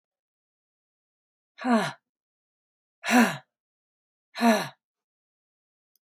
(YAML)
exhalation_length: 6.0 s
exhalation_amplitude: 15812
exhalation_signal_mean_std_ratio: 0.28
survey_phase: beta (2021-08-13 to 2022-03-07)
age: 45-64
gender: Female
wearing_mask: 'No'
symptom_sore_throat: true
symptom_fatigue: true
symptom_headache: true
symptom_other: true
smoker_status: Never smoked
respiratory_condition_asthma: false
respiratory_condition_other: false
recruitment_source: Test and Trace
submission_delay: 1 day
covid_test_result: Positive
covid_test_method: ePCR